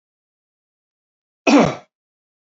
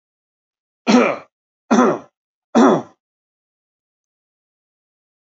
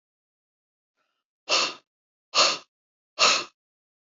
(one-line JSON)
{"cough_length": "2.5 s", "cough_amplitude": 27716, "cough_signal_mean_std_ratio": 0.26, "three_cough_length": "5.4 s", "three_cough_amplitude": 27372, "three_cough_signal_mean_std_ratio": 0.31, "exhalation_length": "4.1 s", "exhalation_amplitude": 19747, "exhalation_signal_mean_std_ratio": 0.31, "survey_phase": "alpha (2021-03-01 to 2021-08-12)", "age": "45-64", "gender": "Male", "wearing_mask": "No", "symptom_none": true, "smoker_status": "Never smoked", "respiratory_condition_asthma": false, "respiratory_condition_other": false, "recruitment_source": "REACT", "submission_delay": "1 day", "covid_test_result": "Negative", "covid_test_method": "RT-qPCR"}